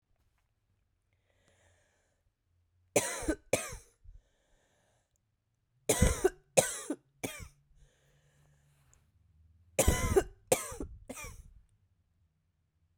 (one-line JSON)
{"three_cough_length": "13.0 s", "three_cough_amplitude": 17350, "three_cough_signal_mean_std_ratio": 0.28, "survey_phase": "beta (2021-08-13 to 2022-03-07)", "age": "45-64", "gender": "Female", "wearing_mask": "No", "symptom_cough_any": true, "symptom_runny_or_blocked_nose": true, "symptom_sore_throat": true, "symptom_fatigue": true, "symptom_fever_high_temperature": true, "symptom_headache": true, "symptom_change_to_sense_of_smell_or_taste": true, "symptom_other": true, "symptom_onset": "3 days", "smoker_status": "Ex-smoker", "respiratory_condition_asthma": false, "respiratory_condition_other": false, "recruitment_source": "Test and Trace", "submission_delay": "2 days", "covid_test_result": "Positive", "covid_test_method": "RT-qPCR", "covid_ct_value": 16.3, "covid_ct_gene": "ORF1ab gene", "covid_ct_mean": 16.7, "covid_viral_load": "3200000 copies/ml", "covid_viral_load_category": "High viral load (>1M copies/ml)"}